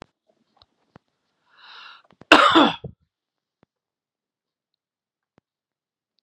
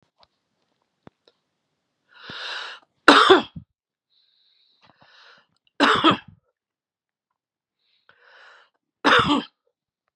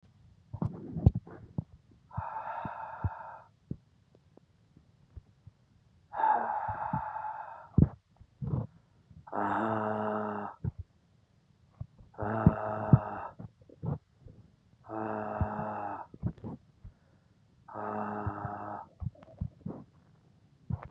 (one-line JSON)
{"cough_length": "6.2 s", "cough_amplitude": 32768, "cough_signal_mean_std_ratio": 0.2, "three_cough_length": "10.2 s", "three_cough_amplitude": 32768, "three_cough_signal_mean_std_ratio": 0.26, "exhalation_length": "20.9 s", "exhalation_amplitude": 13732, "exhalation_signal_mean_std_ratio": 0.42, "survey_phase": "beta (2021-08-13 to 2022-03-07)", "age": "45-64", "gender": "Male", "wearing_mask": "No", "symptom_runny_or_blocked_nose": true, "symptom_onset": "8 days", "smoker_status": "Never smoked", "respiratory_condition_asthma": false, "respiratory_condition_other": false, "recruitment_source": "REACT", "submission_delay": "1 day", "covid_test_result": "Positive", "covid_test_method": "RT-qPCR", "covid_ct_value": 29.0, "covid_ct_gene": "N gene", "influenza_a_test_result": "Negative", "influenza_b_test_result": "Negative"}